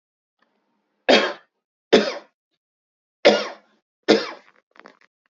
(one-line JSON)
{"cough_length": "5.3 s", "cough_amplitude": 30545, "cough_signal_mean_std_ratio": 0.28, "survey_phase": "alpha (2021-03-01 to 2021-08-12)", "age": "45-64", "gender": "Male", "wearing_mask": "No", "symptom_cough_any": true, "symptom_diarrhoea": true, "smoker_status": "Never smoked", "respiratory_condition_asthma": false, "respiratory_condition_other": false, "recruitment_source": "Test and Trace", "submission_delay": "2 days", "covid_test_result": "Positive", "covid_test_method": "ePCR"}